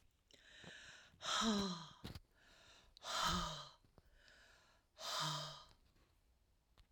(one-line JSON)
{"exhalation_length": "6.9 s", "exhalation_amplitude": 1583, "exhalation_signal_mean_std_ratio": 0.47, "survey_phase": "alpha (2021-03-01 to 2021-08-12)", "age": "65+", "gender": "Female", "wearing_mask": "No", "symptom_none": true, "smoker_status": "Never smoked", "respiratory_condition_asthma": false, "respiratory_condition_other": false, "recruitment_source": "REACT", "submission_delay": "3 days", "covid_test_result": "Negative", "covid_test_method": "RT-qPCR"}